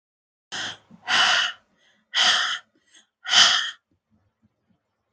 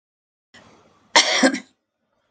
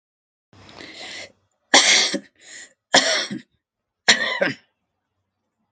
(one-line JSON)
{"exhalation_length": "5.1 s", "exhalation_amplitude": 26188, "exhalation_signal_mean_std_ratio": 0.41, "cough_length": "2.3 s", "cough_amplitude": 31800, "cough_signal_mean_std_ratio": 0.31, "three_cough_length": "5.7 s", "three_cough_amplitude": 32369, "three_cough_signal_mean_std_ratio": 0.35, "survey_phase": "alpha (2021-03-01 to 2021-08-12)", "age": "45-64", "gender": "Female", "wearing_mask": "No", "symptom_none": true, "smoker_status": "Ex-smoker", "respiratory_condition_asthma": false, "respiratory_condition_other": false, "recruitment_source": "Test and Trace", "submission_delay": "2 days", "covid_test_result": "Positive", "covid_test_method": "RT-qPCR", "covid_ct_value": 37.4, "covid_ct_gene": "N gene"}